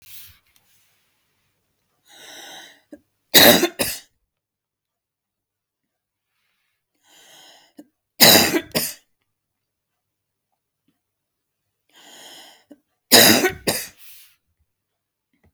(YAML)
three_cough_length: 15.5 s
three_cough_amplitude: 32768
three_cough_signal_mean_std_ratio: 0.24
survey_phase: beta (2021-08-13 to 2022-03-07)
age: 45-64
gender: Female
wearing_mask: 'No'
symptom_runny_or_blocked_nose: true
symptom_onset: 12 days
smoker_status: Never smoked
respiratory_condition_asthma: false
respiratory_condition_other: false
recruitment_source: REACT
submission_delay: 2 days
covid_test_result: Negative
covid_test_method: RT-qPCR
influenza_a_test_result: Negative
influenza_b_test_result: Negative